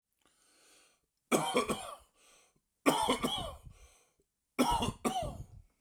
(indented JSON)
{
  "three_cough_length": "5.8 s",
  "three_cough_amplitude": 8677,
  "three_cough_signal_mean_std_ratio": 0.44,
  "survey_phase": "beta (2021-08-13 to 2022-03-07)",
  "age": "45-64",
  "gender": "Male",
  "wearing_mask": "No",
  "symptom_shortness_of_breath": true,
  "symptom_fatigue": true,
  "smoker_status": "Never smoked",
  "respiratory_condition_asthma": false,
  "respiratory_condition_other": false,
  "recruitment_source": "REACT",
  "submission_delay": "1 day",
  "covid_test_result": "Negative",
  "covid_test_method": "RT-qPCR"
}